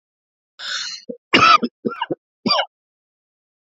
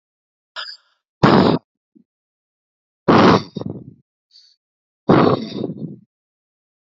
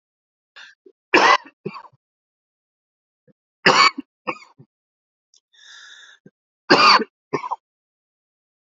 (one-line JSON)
{"cough_length": "3.8 s", "cough_amplitude": 28801, "cough_signal_mean_std_ratio": 0.35, "exhalation_length": "7.0 s", "exhalation_amplitude": 32768, "exhalation_signal_mean_std_ratio": 0.34, "three_cough_length": "8.6 s", "three_cough_amplitude": 30727, "three_cough_signal_mean_std_ratio": 0.27, "survey_phase": "beta (2021-08-13 to 2022-03-07)", "age": "45-64", "gender": "Male", "wearing_mask": "No", "symptom_cough_any": true, "smoker_status": "Never smoked", "respiratory_condition_asthma": false, "respiratory_condition_other": false, "recruitment_source": "REACT", "submission_delay": "0 days", "covid_test_result": "Negative", "covid_test_method": "RT-qPCR"}